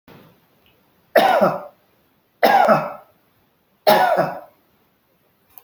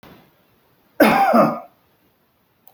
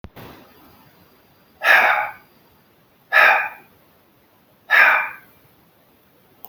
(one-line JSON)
{"three_cough_length": "5.6 s", "three_cough_amplitude": 29745, "three_cough_signal_mean_std_ratio": 0.41, "cough_length": "2.7 s", "cough_amplitude": 28593, "cough_signal_mean_std_ratio": 0.38, "exhalation_length": "6.5 s", "exhalation_amplitude": 27671, "exhalation_signal_mean_std_ratio": 0.35, "survey_phase": "beta (2021-08-13 to 2022-03-07)", "age": "65+", "gender": "Male", "wearing_mask": "No", "symptom_none": true, "smoker_status": "Ex-smoker", "respiratory_condition_asthma": false, "respiratory_condition_other": false, "recruitment_source": "REACT", "submission_delay": "2 days", "covid_test_result": "Negative", "covid_test_method": "RT-qPCR"}